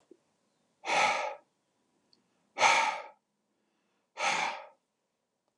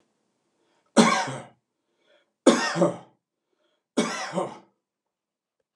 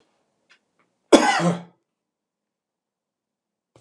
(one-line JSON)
{"exhalation_length": "5.6 s", "exhalation_amplitude": 10191, "exhalation_signal_mean_std_ratio": 0.37, "three_cough_length": "5.8 s", "three_cough_amplitude": 24907, "three_cough_signal_mean_std_ratio": 0.33, "cough_length": "3.8 s", "cough_amplitude": 32767, "cough_signal_mean_std_ratio": 0.24, "survey_phase": "beta (2021-08-13 to 2022-03-07)", "age": "65+", "gender": "Male", "wearing_mask": "No", "symptom_none": true, "smoker_status": "Ex-smoker", "respiratory_condition_asthma": false, "respiratory_condition_other": false, "recruitment_source": "REACT", "submission_delay": "1 day", "covid_test_result": "Negative", "covid_test_method": "RT-qPCR"}